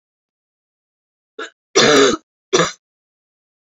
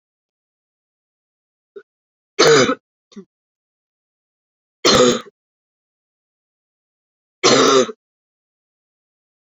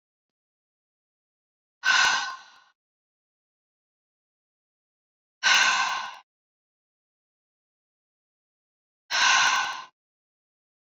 cough_length: 3.8 s
cough_amplitude: 30969
cough_signal_mean_std_ratio: 0.32
three_cough_length: 9.5 s
three_cough_amplitude: 32321
three_cough_signal_mean_std_ratio: 0.28
exhalation_length: 10.9 s
exhalation_amplitude: 13907
exhalation_signal_mean_std_ratio: 0.32
survey_phase: beta (2021-08-13 to 2022-03-07)
age: 18-44
gender: Female
wearing_mask: 'No'
symptom_cough_any: true
symptom_runny_or_blocked_nose: true
symptom_headache: true
symptom_onset: 3 days
smoker_status: Never smoked
respiratory_condition_asthma: false
respiratory_condition_other: false
recruitment_source: Test and Trace
submission_delay: 2 days
covid_test_result: Positive
covid_test_method: RT-qPCR
covid_ct_value: 21.9
covid_ct_gene: ORF1ab gene
covid_ct_mean: 22.7
covid_viral_load: 35000 copies/ml
covid_viral_load_category: Low viral load (10K-1M copies/ml)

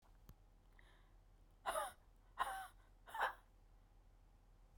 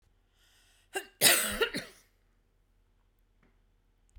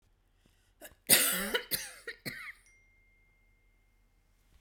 exhalation_length: 4.8 s
exhalation_amplitude: 1502
exhalation_signal_mean_std_ratio: 0.42
cough_length: 4.2 s
cough_amplitude: 14725
cough_signal_mean_std_ratio: 0.27
three_cough_length: 4.6 s
three_cough_amplitude: 15793
three_cough_signal_mean_std_ratio: 0.3
survey_phase: beta (2021-08-13 to 2022-03-07)
age: 45-64
gender: Female
wearing_mask: 'No'
symptom_fatigue: true
symptom_onset: 13 days
smoker_status: Never smoked
respiratory_condition_asthma: false
respiratory_condition_other: false
recruitment_source: REACT
submission_delay: 1 day
covid_test_result: Negative
covid_test_method: RT-qPCR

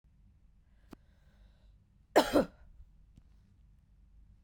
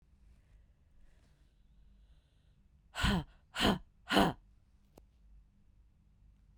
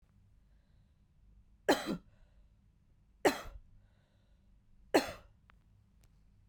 cough_length: 4.4 s
cough_amplitude: 9272
cough_signal_mean_std_ratio: 0.22
exhalation_length: 6.6 s
exhalation_amplitude: 7771
exhalation_signal_mean_std_ratio: 0.29
three_cough_length: 6.5 s
three_cough_amplitude: 6786
three_cough_signal_mean_std_ratio: 0.24
survey_phase: beta (2021-08-13 to 2022-03-07)
age: 18-44
gender: Female
wearing_mask: 'No'
symptom_cough_any: true
symptom_runny_or_blocked_nose: true
symptom_headache: true
symptom_other: true
symptom_onset: 4 days
smoker_status: Current smoker (e-cigarettes or vapes only)
respiratory_condition_asthma: false
respiratory_condition_other: false
recruitment_source: Test and Trace
submission_delay: 2 days
covid_test_result: Positive
covid_test_method: ePCR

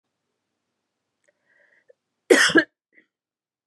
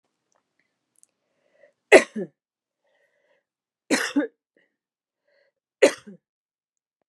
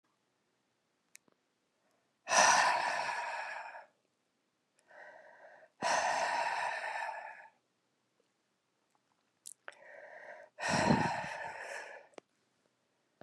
cough_length: 3.7 s
cough_amplitude: 30334
cough_signal_mean_std_ratio: 0.22
three_cough_length: 7.1 s
three_cough_amplitude: 32767
three_cough_signal_mean_std_ratio: 0.18
exhalation_length: 13.2 s
exhalation_amplitude: 7422
exhalation_signal_mean_std_ratio: 0.42
survey_phase: beta (2021-08-13 to 2022-03-07)
age: 45-64
gender: Female
wearing_mask: 'Yes'
symptom_cough_any: true
symptom_runny_or_blocked_nose: true
symptom_shortness_of_breath: true
symptom_fatigue: true
symptom_fever_high_temperature: true
symptom_change_to_sense_of_smell_or_taste: true
symptom_other: true
smoker_status: Never smoked
respiratory_condition_asthma: false
respiratory_condition_other: false
recruitment_source: Test and Trace
submission_delay: 2 days
covid_test_result: Positive
covid_test_method: RT-qPCR
covid_ct_value: 16.8
covid_ct_gene: ORF1ab gene
covid_ct_mean: 17.4
covid_viral_load: 1900000 copies/ml
covid_viral_load_category: High viral load (>1M copies/ml)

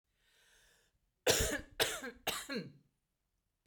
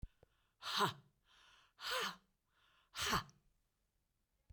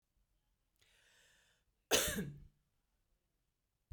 three_cough_length: 3.7 s
three_cough_amplitude: 6228
three_cough_signal_mean_std_ratio: 0.38
exhalation_length: 4.5 s
exhalation_amplitude: 2276
exhalation_signal_mean_std_ratio: 0.36
cough_length: 3.9 s
cough_amplitude: 5277
cough_signal_mean_std_ratio: 0.25
survey_phase: beta (2021-08-13 to 2022-03-07)
age: 45-64
gender: Female
wearing_mask: 'No'
symptom_cough_any: true
smoker_status: Ex-smoker
respiratory_condition_asthma: false
respiratory_condition_other: false
recruitment_source: REACT
submission_delay: 2 days
covid_test_result: Negative
covid_test_method: RT-qPCR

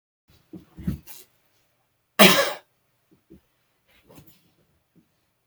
cough_length: 5.5 s
cough_amplitude: 32768
cough_signal_mean_std_ratio: 0.2
survey_phase: beta (2021-08-13 to 2022-03-07)
age: 65+
gender: Male
wearing_mask: 'No'
symptom_cough_any: true
symptom_sore_throat: true
symptom_onset: 2 days
smoker_status: Ex-smoker
respiratory_condition_asthma: false
respiratory_condition_other: false
recruitment_source: Test and Trace
submission_delay: 1 day
covid_test_result: Positive
covid_test_method: RT-qPCR
covid_ct_value: 19.7
covid_ct_gene: N gene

